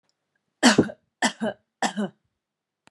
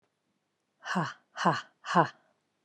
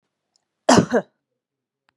three_cough_length: 2.9 s
three_cough_amplitude: 25392
three_cough_signal_mean_std_ratio: 0.32
exhalation_length: 2.6 s
exhalation_amplitude: 11797
exhalation_signal_mean_std_ratio: 0.35
cough_length: 2.0 s
cough_amplitude: 30075
cough_signal_mean_std_ratio: 0.28
survey_phase: beta (2021-08-13 to 2022-03-07)
age: 45-64
gender: Female
wearing_mask: 'No'
symptom_runny_or_blocked_nose: true
symptom_headache: true
symptom_onset: 3 days
smoker_status: Never smoked
respiratory_condition_asthma: false
respiratory_condition_other: false
recruitment_source: Test and Trace
submission_delay: 1 day
covid_test_result: Positive
covid_test_method: RT-qPCR
covid_ct_value: 20.8
covid_ct_gene: ORF1ab gene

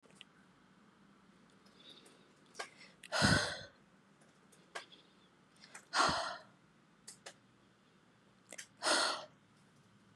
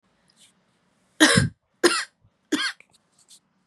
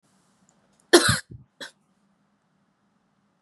exhalation_length: 10.2 s
exhalation_amplitude: 4819
exhalation_signal_mean_std_ratio: 0.33
three_cough_length: 3.7 s
three_cough_amplitude: 29316
three_cough_signal_mean_std_ratio: 0.31
cough_length: 3.4 s
cough_amplitude: 31341
cough_signal_mean_std_ratio: 0.2
survey_phase: beta (2021-08-13 to 2022-03-07)
age: 18-44
gender: Female
wearing_mask: 'No'
symptom_cough_any: true
symptom_runny_or_blocked_nose: true
symptom_sore_throat: true
symptom_fatigue: true
symptom_fever_high_temperature: true
symptom_headache: true
symptom_onset: 6 days
smoker_status: Never smoked
respiratory_condition_asthma: false
respiratory_condition_other: false
recruitment_source: Test and Trace
submission_delay: 2 days
covid_test_result: Positive
covid_test_method: ePCR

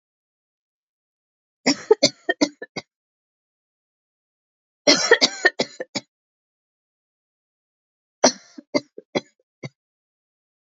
three_cough_length: 10.7 s
three_cough_amplitude: 30768
three_cough_signal_mean_std_ratio: 0.22
survey_phase: beta (2021-08-13 to 2022-03-07)
age: 45-64
gender: Female
wearing_mask: 'No'
symptom_cough_any: true
symptom_onset: 5 days
smoker_status: Ex-smoker
respiratory_condition_asthma: false
respiratory_condition_other: false
recruitment_source: Test and Trace
submission_delay: 2 days
covid_test_result: Positive
covid_test_method: RT-qPCR
covid_ct_value: 24.6
covid_ct_gene: ORF1ab gene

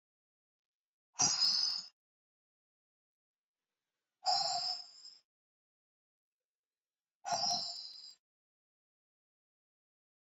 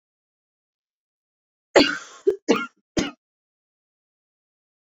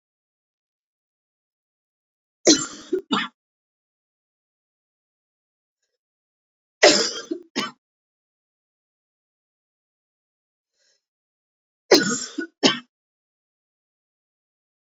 exhalation_length: 10.3 s
exhalation_amplitude: 4412
exhalation_signal_mean_std_ratio: 0.33
cough_length: 4.9 s
cough_amplitude: 28605
cough_signal_mean_std_ratio: 0.24
three_cough_length: 14.9 s
three_cough_amplitude: 27531
three_cough_signal_mean_std_ratio: 0.21
survey_phase: beta (2021-08-13 to 2022-03-07)
age: 45-64
gender: Female
wearing_mask: 'No'
symptom_runny_or_blocked_nose: true
smoker_status: Never smoked
respiratory_condition_asthma: false
respiratory_condition_other: false
recruitment_source: Test and Trace
submission_delay: 1 day
covid_test_result: Positive
covid_test_method: RT-qPCR
covid_ct_value: 20.5
covid_ct_gene: ORF1ab gene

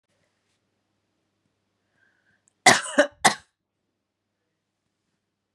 cough_length: 5.5 s
cough_amplitude: 30888
cough_signal_mean_std_ratio: 0.18
survey_phase: beta (2021-08-13 to 2022-03-07)
age: 45-64
gender: Female
wearing_mask: 'No'
symptom_none: true
smoker_status: Ex-smoker
respiratory_condition_asthma: false
respiratory_condition_other: false
recruitment_source: REACT
submission_delay: 2 days
covid_test_result: Negative
covid_test_method: RT-qPCR
influenza_a_test_result: Negative
influenza_b_test_result: Negative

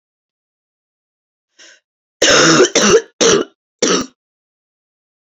cough_length: 5.3 s
cough_amplitude: 31479
cough_signal_mean_std_ratio: 0.4
survey_phase: beta (2021-08-13 to 2022-03-07)
age: 18-44
gender: Female
wearing_mask: 'No'
symptom_cough_any: true
symptom_runny_or_blocked_nose: true
symptom_shortness_of_breath: true
symptom_sore_throat: true
symptom_abdominal_pain: true
symptom_diarrhoea: true
symptom_fatigue: true
symptom_fever_high_temperature: true
symptom_headache: true
symptom_change_to_sense_of_smell_or_taste: true
symptom_loss_of_taste: true
smoker_status: Ex-smoker
respiratory_condition_asthma: false
respiratory_condition_other: false
recruitment_source: Test and Trace
submission_delay: 2 days
covid_test_result: Positive
covid_test_method: RT-qPCR
covid_ct_value: 27.6
covid_ct_gene: ORF1ab gene
covid_ct_mean: 28.3
covid_viral_load: 510 copies/ml
covid_viral_load_category: Minimal viral load (< 10K copies/ml)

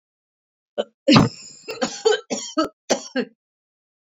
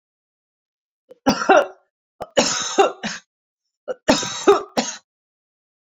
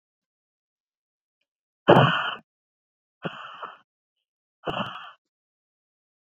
cough_length: 4.0 s
cough_amplitude: 31975
cough_signal_mean_std_ratio: 0.37
three_cough_length: 6.0 s
three_cough_amplitude: 30651
three_cough_signal_mean_std_ratio: 0.36
exhalation_length: 6.2 s
exhalation_amplitude: 27362
exhalation_signal_mean_std_ratio: 0.23
survey_phase: beta (2021-08-13 to 2022-03-07)
age: 18-44
gender: Female
wearing_mask: 'No'
symptom_cough_any: true
symptom_shortness_of_breath: true
symptom_fatigue: true
symptom_headache: true
symptom_change_to_sense_of_smell_or_taste: true
symptom_onset: 4 days
smoker_status: Never smoked
respiratory_condition_asthma: false
respiratory_condition_other: false
recruitment_source: Test and Trace
submission_delay: 2 days
covid_test_result: Positive
covid_test_method: RT-qPCR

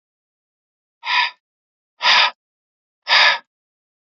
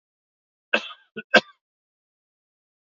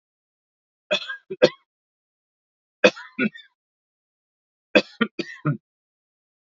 exhalation_length: 4.2 s
exhalation_amplitude: 32767
exhalation_signal_mean_std_ratio: 0.34
cough_length: 2.8 s
cough_amplitude: 27848
cough_signal_mean_std_ratio: 0.17
three_cough_length: 6.5 s
three_cough_amplitude: 29797
three_cough_signal_mean_std_ratio: 0.22
survey_phase: alpha (2021-03-01 to 2021-08-12)
age: 45-64
gender: Male
wearing_mask: 'No'
symptom_change_to_sense_of_smell_or_taste: true
smoker_status: Never smoked
respiratory_condition_asthma: false
respiratory_condition_other: false
recruitment_source: REACT
submission_delay: 2 days
covid_test_result: Negative
covid_test_method: RT-qPCR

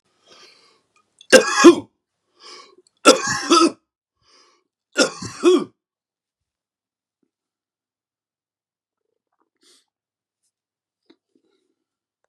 three_cough_length: 12.3 s
three_cough_amplitude: 32768
three_cough_signal_mean_std_ratio: 0.23
survey_phase: beta (2021-08-13 to 2022-03-07)
age: 45-64
gender: Male
wearing_mask: 'No'
symptom_none: true
smoker_status: Current smoker (11 or more cigarettes per day)
respiratory_condition_asthma: false
respiratory_condition_other: false
recruitment_source: Test and Trace
submission_delay: 2 days
covid_test_result: Positive
covid_test_method: ePCR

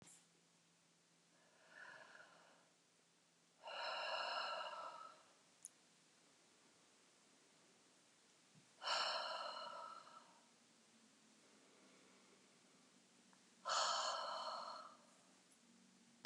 exhalation_length: 16.3 s
exhalation_amplitude: 1450
exhalation_signal_mean_std_ratio: 0.45
survey_phase: beta (2021-08-13 to 2022-03-07)
age: 65+
gender: Female
wearing_mask: 'No'
symptom_none: true
smoker_status: Never smoked
respiratory_condition_asthma: false
respiratory_condition_other: false
recruitment_source: REACT
submission_delay: 0 days
covid_test_result: Negative
covid_test_method: RT-qPCR
covid_ct_value: 39.0
covid_ct_gene: N gene
influenza_a_test_result: Negative
influenza_b_test_result: Negative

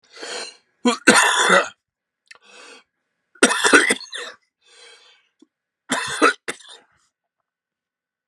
three_cough_length: 8.3 s
three_cough_amplitude: 32768
three_cough_signal_mean_std_ratio: 0.35
survey_phase: beta (2021-08-13 to 2022-03-07)
age: 45-64
gender: Male
wearing_mask: 'No'
symptom_runny_or_blocked_nose: true
symptom_sore_throat: true
symptom_fatigue: true
symptom_headache: true
symptom_onset: 4 days
smoker_status: Ex-smoker
respiratory_condition_asthma: false
respiratory_condition_other: false
recruitment_source: Test and Trace
submission_delay: 1 day
covid_test_result: Positive
covid_test_method: ePCR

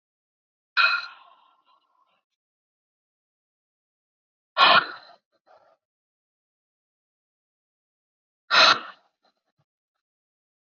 exhalation_length: 10.8 s
exhalation_amplitude: 20733
exhalation_signal_mean_std_ratio: 0.21
survey_phase: alpha (2021-03-01 to 2021-08-12)
age: 18-44
gender: Female
wearing_mask: 'No'
symptom_none: true
symptom_onset: 5 days
smoker_status: Ex-smoker
respiratory_condition_asthma: false
respiratory_condition_other: false
recruitment_source: REACT
submission_delay: 1 day
covid_test_result: Negative
covid_test_method: RT-qPCR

